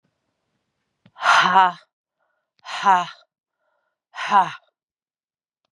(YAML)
exhalation_length: 5.7 s
exhalation_amplitude: 28042
exhalation_signal_mean_std_ratio: 0.32
survey_phase: beta (2021-08-13 to 2022-03-07)
age: 45-64
gender: Female
wearing_mask: 'No'
symptom_cough_any: true
symptom_shortness_of_breath: true
symptom_fatigue: true
symptom_change_to_sense_of_smell_or_taste: true
symptom_other: true
smoker_status: Ex-smoker
respiratory_condition_asthma: false
respiratory_condition_other: false
recruitment_source: Test and Trace
submission_delay: 1 day
covid_test_result: Positive
covid_test_method: LFT